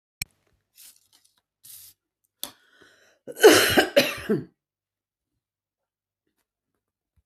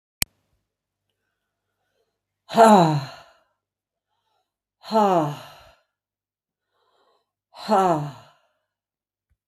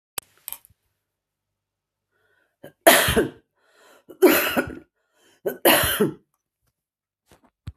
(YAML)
cough_length: 7.3 s
cough_amplitude: 27995
cough_signal_mean_std_ratio: 0.23
exhalation_length: 9.5 s
exhalation_amplitude: 30318
exhalation_signal_mean_std_ratio: 0.28
three_cough_length: 7.8 s
three_cough_amplitude: 32766
three_cough_signal_mean_std_ratio: 0.31
survey_phase: beta (2021-08-13 to 2022-03-07)
age: 65+
gender: Female
wearing_mask: 'No'
symptom_cough_any: true
symptom_runny_or_blocked_nose: true
symptom_fatigue: true
symptom_other: true
smoker_status: Ex-smoker
respiratory_condition_asthma: false
respiratory_condition_other: false
recruitment_source: Test and Trace
submission_delay: 1 day
covid_test_result: Positive
covid_test_method: LFT